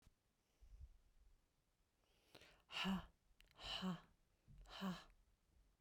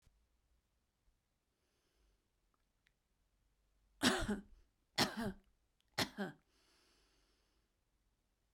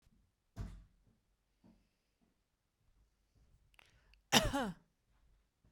{
  "exhalation_length": "5.8 s",
  "exhalation_amplitude": 737,
  "exhalation_signal_mean_std_ratio": 0.4,
  "three_cough_length": "8.5 s",
  "three_cough_amplitude": 4449,
  "three_cough_signal_mean_std_ratio": 0.25,
  "cough_length": "5.7 s",
  "cough_amplitude": 7871,
  "cough_signal_mean_std_ratio": 0.22,
  "survey_phase": "beta (2021-08-13 to 2022-03-07)",
  "age": "45-64",
  "gender": "Female",
  "wearing_mask": "No",
  "symptom_cough_any": true,
  "symptom_runny_or_blocked_nose": true,
  "symptom_sore_throat": true,
  "symptom_headache": true,
  "symptom_change_to_sense_of_smell_or_taste": true,
  "symptom_loss_of_taste": true,
  "symptom_onset": "5 days",
  "smoker_status": "Ex-smoker",
  "respiratory_condition_asthma": false,
  "respiratory_condition_other": false,
  "recruitment_source": "Test and Trace",
  "submission_delay": "2 days",
  "covid_test_result": "Positive",
  "covid_test_method": "RT-qPCR",
  "covid_ct_value": 16.6,
  "covid_ct_gene": "ORF1ab gene",
  "covid_ct_mean": 16.9,
  "covid_viral_load": "2900000 copies/ml",
  "covid_viral_load_category": "High viral load (>1M copies/ml)"
}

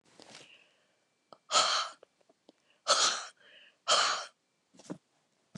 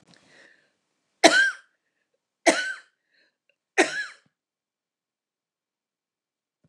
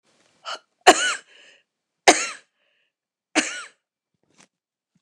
{
  "exhalation_length": "5.6 s",
  "exhalation_amplitude": 8444,
  "exhalation_signal_mean_std_ratio": 0.36,
  "three_cough_length": "6.7 s",
  "three_cough_amplitude": 29203,
  "three_cough_signal_mean_std_ratio": 0.23,
  "cough_length": "5.0 s",
  "cough_amplitude": 29204,
  "cough_signal_mean_std_ratio": 0.23,
  "survey_phase": "beta (2021-08-13 to 2022-03-07)",
  "age": "65+",
  "gender": "Female",
  "wearing_mask": "No",
  "symptom_runny_or_blocked_nose": true,
  "symptom_headache": true,
  "smoker_status": "Ex-smoker",
  "respiratory_condition_asthma": false,
  "respiratory_condition_other": false,
  "recruitment_source": "Test and Trace",
  "submission_delay": "2 days",
  "covid_test_result": "Positive",
  "covid_test_method": "RT-qPCR",
  "covid_ct_value": 29.4,
  "covid_ct_gene": "ORF1ab gene"
}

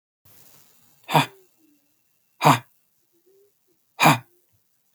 {
  "exhalation_length": "4.9 s",
  "exhalation_amplitude": 30708,
  "exhalation_signal_mean_std_ratio": 0.24,
  "survey_phase": "beta (2021-08-13 to 2022-03-07)",
  "age": "18-44",
  "gender": "Male",
  "wearing_mask": "No",
  "symptom_none": true,
  "smoker_status": "Never smoked",
  "respiratory_condition_asthma": false,
  "respiratory_condition_other": false,
  "recruitment_source": "Test and Trace",
  "submission_delay": "1 day",
  "covid_test_result": "Negative",
  "covid_test_method": "RT-qPCR"
}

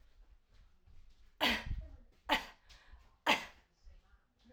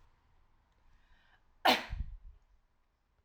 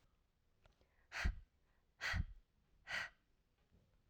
{
  "three_cough_length": "4.5 s",
  "three_cough_amplitude": 5126,
  "three_cough_signal_mean_std_ratio": 0.34,
  "cough_length": "3.2 s",
  "cough_amplitude": 7766,
  "cough_signal_mean_std_ratio": 0.25,
  "exhalation_length": "4.1 s",
  "exhalation_amplitude": 1595,
  "exhalation_signal_mean_std_ratio": 0.35,
  "survey_phase": "alpha (2021-03-01 to 2021-08-12)",
  "age": "18-44",
  "gender": "Female",
  "wearing_mask": "No",
  "symptom_none": true,
  "smoker_status": "Never smoked",
  "respiratory_condition_asthma": false,
  "respiratory_condition_other": false,
  "recruitment_source": "REACT",
  "submission_delay": "2 days",
  "covid_test_result": "Negative",
  "covid_test_method": "RT-qPCR"
}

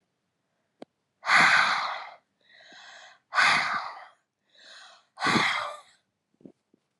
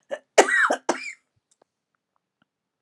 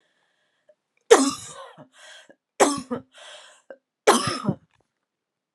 {
  "exhalation_length": "7.0 s",
  "exhalation_amplitude": 15031,
  "exhalation_signal_mean_std_ratio": 0.41,
  "cough_length": "2.8 s",
  "cough_amplitude": 32428,
  "cough_signal_mean_std_ratio": 0.31,
  "three_cough_length": "5.5 s",
  "three_cough_amplitude": 32069,
  "three_cough_signal_mean_std_ratio": 0.28,
  "survey_phase": "beta (2021-08-13 to 2022-03-07)",
  "age": "18-44",
  "gender": "Female",
  "wearing_mask": "No",
  "symptom_new_continuous_cough": true,
  "symptom_sore_throat": true,
  "smoker_status": "Never smoked",
  "respiratory_condition_asthma": false,
  "respiratory_condition_other": false,
  "recruitment_source": "Test and Trace",
  "submission_delay": "1 day",
  "covid_test_result": "Positive",
  "covid_test_method": "LFT"
}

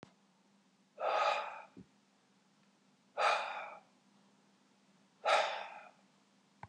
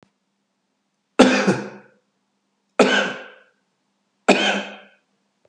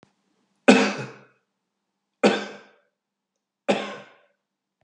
{
  "exhalation_length": "6.7 s",
  "exhalation_amplitude": 4067,
  "exhalation_signal_mean_std_ratio": 0.38,
  "cough_length": "5.5 s",
  "cough_amplitude": 32768,
  "cough_signal_mean_std_ratio": 0.34,
  "three_cough_length": "4.8 s",
  "three_cough_amplitude": 32731,
  "three_cough_signal_mean_std_ratio": 0.27,
  "survey_phase": "beta (2021-08-13 to 2022-03-07)",
  "age": "65+",
  "gender": "Male",
  "wearing_mask": "No",
  "symptom_new_continuous_cough": true,
  "smoker_status": "Ex-smoker",
  "respiratory_condition_asthma": false,
  "respiratory_condition_other": false,
  "recruitment_source": "REACT",
  "submission_delay": "1 day",
  "covid_test_result": "Negative",
  "covid_test_method": "RT-qPCR",
  "influenza_a_test_result": "Negative",
  "influenza_b_test_result": "Negative"
}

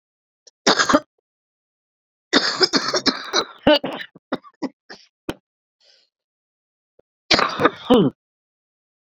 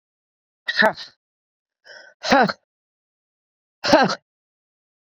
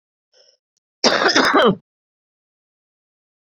{
  "three_cough_length": "9.0 s",
  "three_cough_amplitude": 32768,
  "three_cough_signal_mean_std_ratio": 0.35,
  "exhalation_length": "5.1 s",
  "exhalation_amplitude": 27704,
  "exhalation_signal_mean_std_ratio": 0.28,
  "cough_length": "3.5 s",
  "cough_amplitude": 29525,
  "cough_signal_mean_std_ratio": 0.35,
  "survey_phase": "beta (2021-08-13 to 2022-03-07)",
  "age": "45-64",
  "gender": "Female",
  "wearing_mask": "No",
  "symptom_cough_any": true,
  "symptom_sore_throat": true,
  "symptom_abdominal_pain": true,
  "symptom_fatigue": true,
  "symptom_fever_high_temperature": true,
  "symptom_headache": true,
  "symptom_change_to_sense_of_smell_or_taste": true,
  "symptom_loss_of_taste": true,
  "symptom_other": true,
  "smoker_status": "Current smoker (1 to 10 cigarettes per day)",
  "respiratory_condition_asthma": false,
  "respiratory_condition_other": false,
  "recruitment_source": "Test and Trace",
  "submission_delay": "2 days",
  "covid_test_result": "Positive",
  "covid_test_method": "LFT"
}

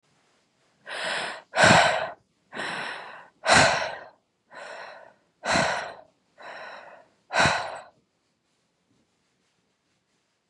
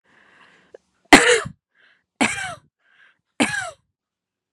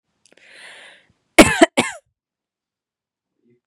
{
  "exhalation_length": "10.5 s",
  "exhalation_amplitude": 24349,
  "exhalation_signal_mean_std_ratio": 0.37,
  "three_cough_length": "4.5 s",
  "three_cough_amplitude": 32768,
  "three_cough_signal_mean_std_ratio": 0.27,
  "cough_length": "3.7 s",
  "cough_amplitude": 32768,
  "cough_signal_mean_std_ratio": 0.21,
  "survey_phase": "beta (2021-08-13 to 2022-03-07)",
  "age": "18-44",
  "gender": "Female",
  "wearing_mask": "No",
  "symptom_none": true,
  "smoker_status": "Never smoked",
  "respiratory_condition_asthma": false,
  "respiratory_condition_other": false,
  "recruitment_source": "REACT",
  "submission_delay": "1 day",
  "covid_test_result": "Negative",
  "covid_test_method": "RT-qPCR",
  "influenza_a_test_result": "Negative",
  "influenza_b_test_result": "Negative"
}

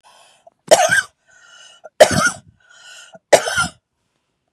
{
  "three_cough_length": "4.5 s",
  "three_cough_amplitude": 32768,
  "three_cough_signal_mean_std_ratio": 0.33,
  "survey_phase": "beta (2021-08-13 to 2022-03-07)",
  "age": "45-64",
  "gender": "Female",
  "wearing_mask": "No",
  "symptom_runny_or_blocked_nose": true,
  "symptom_shortness_of_breath": true,
  "smoker_status": "Never smoked",
  "respiratory_condition_asthma": true,
  "respiratory_condition_other": false,
  "recruitment_source": "REACT",
  "submission_delay": "2 days",
  "covid_test_result": "Negative",
  "covid_test_method": "RT-qPCR",
  "influenza_a_test_result": "Unknown/Void",
  "influenza_b_test_result": "Unknown/Void"
}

